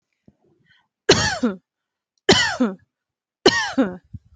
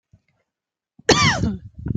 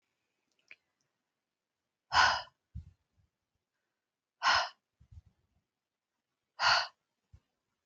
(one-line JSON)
{"three_cough_length": "4.4 s", "three_cough_amplitude": 29267, "three_cough_signal_mean_std_ratio": 0.39, "cough_length": "2.0 s", "cough_amplitude": 29502, "cough_signal_mean_std_ratio": 0.42, "exhalation_length": "7.9 s", "exhalation_amplitude": 6986, "exhalation_signal_mean_std_ratio": 0.25, "survey_phase": "alpha (2021-03-01 to 2021-08-12)", "age": "45-64", "gender": "Female", "wearing_mask": "No", "symptom_none": true, "smoker_status": "Never smoked", "respiratory_condition_asthma": true, "respiratory_condition_other": false, "recruitment_source": "REACT", "submission_delay": "1 day", "covid_test_result": "Negative", "covid_test_method": "RT-qPCR"}